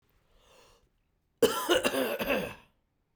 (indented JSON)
{
  "cough_length": "3.2 s",
  "cough_amplitude": 10761,
  "cough_signal_mean_std_ratio": 0.43,
  "survey_phase": "beta (2021-08-13 to 2022-03-07)",
  "age": "18-44",
  "gender": "Male",
  "wearing_mask": "No",
  "symptom_none": true,
  "smoker_status": "Never smoked",
  "respiratory_condition_asthma": false,
  "respiratory_condition_other": false,
  "recruitment_source": "REACT",
  "submission_delay": "1 day",
  "covid_test_result": "Negative",
  "covid_test_method": "RT-qPCR",
  "influenza_a_test_result": "Negative",
  "influenza_b_test_result": "Negative"
}